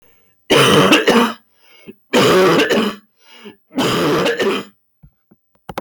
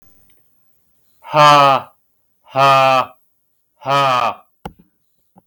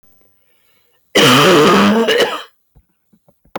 {"three_cough_length": "5.8 s", "three_cough_amplitude": 28855, "three_cough_signal_mean_std_ratio": 0.62, "exhalation_length": "5.5 s", "exhalation_amplitude": 31899, "exhalation_signal_mean_std_ratio": 0.45, "cough_length": "3.6 s", "cough_amplitude": 31102, "cough_signal_mean_std_ratio": 0.56, "survey_phase": "beta (2021-08-13 to 2022-03-07)", "age": "18-44", "gender": "Male", "wearing_mask": "No", "symptom_none": true, "smoker_status": "Never smoked", "respiratory_condition_asthma": false, "respiratory_condition_other": false, "recruitment_source": "REACT", "submission_delay": "2 days", "covid_test_result": "Negative", "covid_test_method": "RT-qPCR", "influenza_a_test_result": "Unknown/Void", "influenza_b_test_result": "Unknown/Void"}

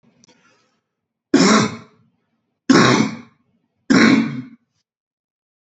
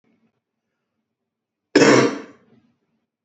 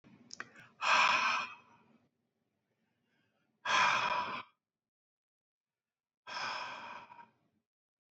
{"three_cough_length": "5.6 s", "three_cough_amplitude": 31075, "three_cough_signal_mean_std_ratio": 0.39, "cough_length": "3.2 s", "cough_amplitude": 29929, "cough_signal_mean_std_ratio": 0.28, "exhalation_length": "8.1 s", "exhalation_amplitude": 4886, "exhalation_signal_mean_std_ratio": 0.38, "survey_phase": "beta (2021-08-13 to 2022-03-07)", "age": "45-64", "gender": "Male", "wearing_mask": "No", "symptom_none": true, "smoker_status": "Ex-smoker", "respiratory_condition_asthma": false, "respiratory_condition_other": false, "recruitment_source": "REACT", "submission_delay": "4 days", "covid_test_result": "Negative", "covid_test_method": "RT-qPCR", "influenza_a_test_result": "Negative", "influenza_b_test_result": "Negative"}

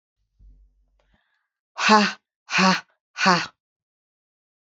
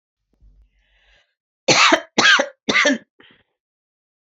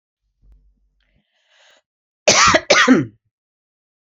{"exhalation_length": "4.7 s", "exhalation_amplitude": 27657, "exhalation_signal_mean_std_ratio": 0.33, "three_cough_length": "4.4 s", "three_cough_amplitude": 28253, "three_cough_signal_mean_std_ratio": 0.36, "cough_length": "4.1 s", "cough_amplitude": 32301, "cough_signal_mean_std_ratio": 0.33, "survey_phase": "beta (2021-08-13 to 2022-03-07)", "age": "45-64", "gender": "Female", "wearing_mask": "No", "symptom_runny_or_blocked_nose": true, "symptom_onset": "4 days", "smoker_status": "Never smoked", "respiratory_condition_asthma": false, "respiratory_condition_other": false, "recruitment_source": "Test and Trace", "submission_delay": "1 day", "covid_test_result": "Positive", "covid_test_method": "ePCR"}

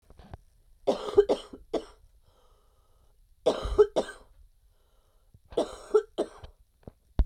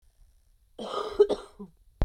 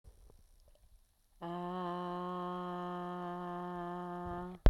{"three_cough_length": "7.3 s", "three_cough_amplitude": 13258, "three_cough_signal_mean_std_ratio": 0.31, "cough_length": "2.0 s", "cough_amplitude": 11948, "cough_signal_mean_std_ratio": 0.34, "exhalation_length": "4.7 s", "exhalation_amplitude": 11086, "exhalation_signal_mean_std_ratio": 0.52, "survey_phase": "beta (2021-08-13 to 2022-03-07)", "age": "18-44", "gender": "Female", "wearing_mask": "No", "symptom_cough_any": true, "symptom_runny_or_blocked_nose": true, "symptom_shortness_of_breath": true, "symptom_sore_throat": true, "symptom_diarrhoea": true, "symptom_headache": true, "symptom_change_to_sense_of_smell_or_taste": true, "symptom_loss_of_taste": true, "symptom_onset": "7 days", "smoker_status": "Current smoker (11 or more cigarettes per day)", "respiratory_condition_asthma": false, "respiratory_condition_other": false, "recruitment_source": "Test and Trace", "submission_delay": "3 days", "covid_test_result": "Positive", "covid_test_method": "RT-qPCR"}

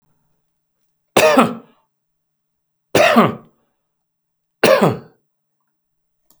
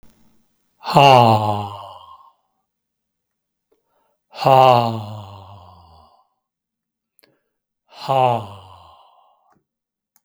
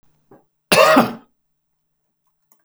{"three_cough_length": "6.4 s", "three_cough_amplitude": 32768, "three_cough_signal_mean_std_ratio": 0.33, "exhalation_length": "10.2 s", "exhalation_amplitude": 32768, "exhalation_signal_mean_std_ratio": 0.31, "cough_length": "2.6 s", "cough_amplitude": 32768, "cough_signal_mean_std_ratio": 0.31, "survey_phase": "beta (2021-08-13 to 2022-03-07)", "age": "65+", "gender": "Male", "wearing_mask": "No", "symptom_none": true, "smoker_status": "Never smoked", "respiratory_condition_asthma": false, "respiratory_condition_other": false, "recruitment_source": "REACT", "submission_delay": "2 days", "covid_test_result": "Negative", "covid_test_method": "RT-qPCR", "influenza_a_test_result": "Negative", "influenza_b_test_result": "Negative"}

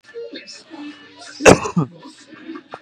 {"cough_length": "2.8 s", "cough_amplitude": 32768, "cough_signal_mean_std_ratio": 0.3, "survey_phase": "beta (2021-08-13 to 2022-03-07)", "age": "18-44", "gender": "Male", "wearing_mask": "No", "symptom_none": true, "smoker_status": "Current smoker (1 to 10 cigarettes per day)", "respiratory_condition_asthma": false, "respiratory_condition_other": false, "recruitment_source": "REACT", "submission_delay": "9 days", "covid_test_result": "Negative", "covid_test_method": "RT-qPCR", "influenza_a_test_result": "Negative", "influenza_b_test_result": "Negative"}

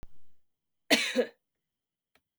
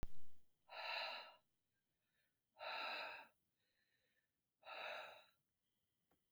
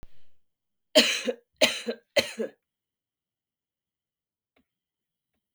{"cough_length": "2.4 s", "cough_amplitude": 13517, "cough_signal_mean_std_ratio": 0.34, "exhalation_length": "6.3 s", "exhalation_amplitude": 666, "exhalation_signal_mean_std_ratio": 0.45, "three_cough_length": "5.5 s", "three_cough_amplitude": 25032, "three_cough_signal_mean_std_ratio": 0.27, "survey_phase": "beta (2021-08-13 to 2022-03-07)", "age": "18-44", "gender": "Female", "wearing_mask": "No", "symptom_runny_or_blocked_nose": true, "symptom_fatigue": true, "symptom_other": true, "smoker_status": "Never smoked", "respiratory_condition_asthma": false, "respiratory_condition_other": false, "recruitment_source": "Test and Trace", "submission_delay": "1 day", "covid_test_result": "Positive", "covid_test_method": "RT-qPCR"}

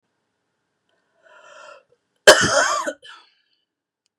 {"cough_length": "4.2 s", "cough_amplitude": 32768, "cough_signal_mean_std_ratio": 0.26, "survey_phase": "beta (2021-08-13 to 2022-03-07)", "age": "45-64", "gender": "Female", "wearing_mask": "No", "symptom_none": true, "smoker_status": "Ex-smoker", "respiratory_condition_asthma": false, "respiratory_condition_other": false, "recruitment_source": "REACT", "submission_delay": "1 day", "covid_test_result": "Negative", "covid_test_method": "RT-qPCR", "influenza_a_test_result": "Negative", "influenza_b_test_result": "Negative"}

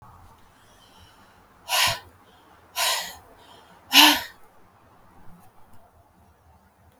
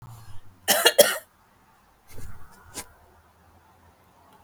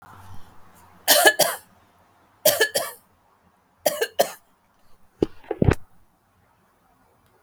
{"exhalation_length": "7.0 s", "exhalation_amplitude": 32766, "exhalation_signal_mean_std_ratio": 0.28, "cough_length": "4.4 s", "cough_amplitude": 29501, "cough_signal_mean_std_ratio": 0.29, "three_cough_length": "7.4 s", "three_cough_amplitude": 32768, "three_cough_signal_mean_std_ratio": 0.31, "survey_phase": "beta (2021-08-13 to 2022-03-07)", "age": "45-64", "gender": "Female", "wearing_mask": "No", "symptom_none": true, "smoker_status": "Never smoked", "respiratory_condition_asthma": false, "respiratory_condition_other": false, "recruitment_source": "REACT", "submission_delay": "7 days", "covid_test_result": "Negative", "covid_test_method": "RT-qPCR"}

